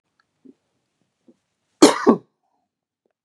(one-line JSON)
{"cough_length": "3.2 s", "cough_amplitude": 32768, "cough_signal_mean_std_ratio": 0.2, "survey_phase": "beta (2021-08-13 to 2022-03-07)", "age": "45-64", "gender": "Male", "wearing_mask": "No", "symptom_none": true, "smoker_status": "Ex-smoker", "respiratory_condition_asthma": true, "respiratory_condition_other": false, "recruitment_source": "Test and Trace", "submission_delay": "2 days", "covid_test_result": "Negative", "covid_test_method": "ePCR"}